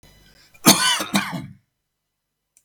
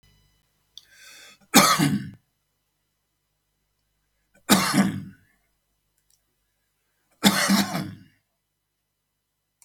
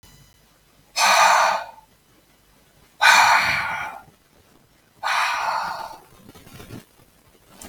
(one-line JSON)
{"cough_length": "2.6 s", "cough_amplitude": 32768, "cough_signal_mean_std_ratio": 0.34, "three_cough_length": "9.6 s", "three_cough_amplitude": 32766, "three_cough_signal_mean_std_ratio": 0.31, "exhalation_length": "7.7 s", "exhalation_amplitude": 32766, "exhalation_signal_mean_std_ratio": 0.44, "survey_phase": "beta (2021-08-13 to 2022-03-07)", "age": "65+", "gender": "Male", "wearing_mask": "No", "symptom_none": true, "smoker_status": "Ex-smoker", "respiratory_condition_asthma": false, "respiratory_condition_other": false, "recruitment_source": "REACT", "submission_delay": "10 days", "covid_test_result": "Negative", "covid_test_method": "RT-qPCR", "influenza_a_test_result": "Negative", "influenza_b_test_result": "Negative"}